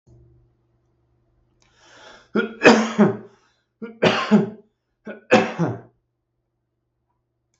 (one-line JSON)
{"three_cough_length": "7.6 s", "three_cough_amplitude": 32768, "three_cough_signal_mean_std_ratio": 0.32, "survey_phase": "beta (2021-08-13 to 2022-03-07)", "age": "45-64", "gender": "Male", "wearing_mask": "No", "symptom_none": true, "smoker_status": "Ex-smoker", "respiratory_condition_asthma": true, "respiratory_condition_other": false, "recruitment_source": "REACT", "submission_delay": "2 days", "covid_test_result": "Negative", "covid_test_method": "RT-qPCR", "influenza_a_test_result": "Negative", "influenza_b_test_result": "Negative"}